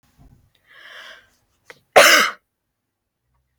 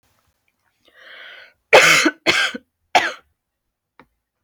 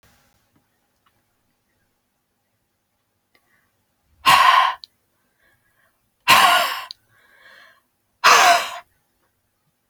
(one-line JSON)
{"cough_length": "3.6 s", "cough_amplitude": 32166, "cough_signal_mean_std_ratio": 0.25, "three_cough_length": "4.4 s", "three_cough_amplitude": 31664, "three_cough_signal_mean_std_ratio": 0.32, "exhalation_length": "9.9 s", "exhalation_amplitude": 31351, "exhalation_signal_mean_std_ratio": 0.3, "survey_phase": "alpha (2021-03-01 to 2021-08-12)", "age": "18-44", "gender": "Female", "wearing_mask": "No", "symptom_none": true, "smoker_status": "Ex-smoker", "respiratory_condition_asthma": true, "respiratory_condition_other": false, "recruitment_source": "REACT", "submission_delay": "14 days", "covid_test_result": "Negative", "covid_test_method": "RT-qPCR"}